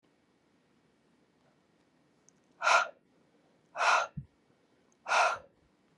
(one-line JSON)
{"exhalation_length": "6.0 s", "exhalation_amplitude": 10035, "exhalation_signal_mean_std_ratio": 0.3, "survey_phase": "beta (2021-08-13 to 2022-03-07)", "age": "45-64", "gender": "Female", "wearing_mask": "No", "symptom_runny_or_blocked_nose": true, "symptom_sore_throat": true, "symptom_fatigue": true, "symptom_headache": true, "smoker_status": "Never smoked", "respiratory_condition_asthma": false, "respiratory_condition_other": false, "recruitment_source": "REACT", "submission_delay": "1 day", "covid_test_result": "Positive", "covid_test_method": "RT-qPCR", "covid_ct_value": 19.0, "covid_ct_gene": "E gene", "influenza_a_test_result": "Negative", "influenza_b_test_result": "Negative"}